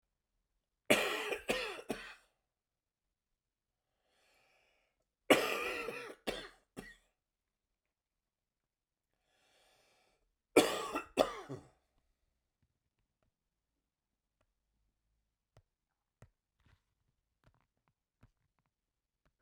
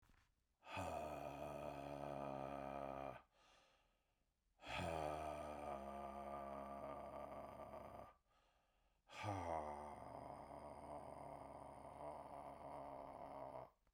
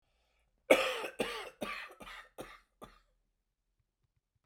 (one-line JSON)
{"three_cough_length": "19.4 s", "three_cough_amplitude": 8485, "three_cough_signal_mean_std_ratio": 0.22, "exhalation_length": "13.9 s", "exhalation_amplitude": 764, "exhalation_signal_mean_std_ratio": 0.78, "cough_length": "4.5 s", "cough_amplitude": 12562, "cough_signal_mean_std_ratio": 0.28, "survey_phase": "beta (2021-08-13 to 2022-03-07)", "age": "45-64", "gender": "Male", "wearing_mask": "No", "symptom_cough_any": true, "symptom_runny_or_blocked_nose": true, "symptom_fatigue": true, "symptom_onset": "4 days", "smoker_status": "Ex-smoker", "respiratory_condition_asthma": false, "respiratory_condition_other": false, "recruitment_source": "Test and Trace", "submission_delay": "2 days", "covid_test_result": "Positive", "covid_test_method": "ePCR"}